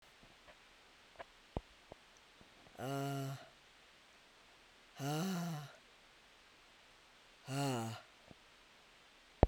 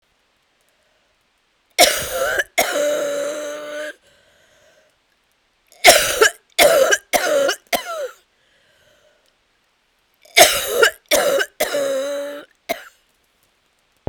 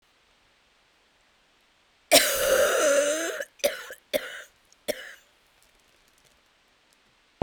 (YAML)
exhalation_length: 9.5 s
exhalation_amplitude: 12660
exhalation_signal_mean_std_ratio: 0.38
three_cough_length: 14.1 s
three_cough_amplitude: 32768
three_cough_signal_mean_std_ratio: 0.43
cough_length: 7.4 s
cough_amplitude: 32079
cough_signal_mean_std_ratio: 0.37
survey_phase: beta (2021-08-13 to 2022-03-07)
age: 45-64
gender: Female
wearing_mask: 'No'
symptom_cough_any: true
symptom_runny_or_blocked_nose: true
symptom_sore_throat: true
symptom_fatigue: true
symptom_fever_high_temperature: true
symptom_headache: true
symptom_change_to_sense_of_smell_or_taste: true
symptom_loss_of_taste: true
symptom_onset: 6 days
smoker_status: Never smoked
respiratory_condition_asthma: false
respiratory_condition_other: false
recruitment_source: Test and Trace
submission_delay: 2 days
covid_test_result: Positive
covid_test_method: RT-qPCR